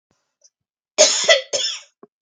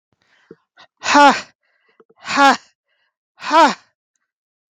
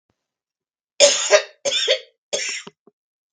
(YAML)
cough_length: 2.2 s
cough_amplitude: 32768
cough_signal_mean_std_ratio: 0.39
exhalation_length: 4.7 s
exhalation_amplitude: 32768
exhalation_signal_mean_std_ratio: 0.33
three_cough_length: 3.3 s
three_cough_amplitude: 32768
three_cough_signal_mean_std_ratio: 0.38
survey_phase: beta (2021-08-13 to 2022-03-07)
age: 45-64
gender: Female
wearing_mask: 'No'
symptom_sore_throat: true
symptom_fatigue: true
symptom_onset: 13 days
smoker_status: Ex-smoker
respiratory_condition_asthma: false
respiratory_condition_other: false
recruitment_source: REACT
submission_delay: 2 days
covid_test_result: Negative
covid_test_method: RT-qPCR
influenza_a_test_result: Negative
influenza_b_test_result: Negative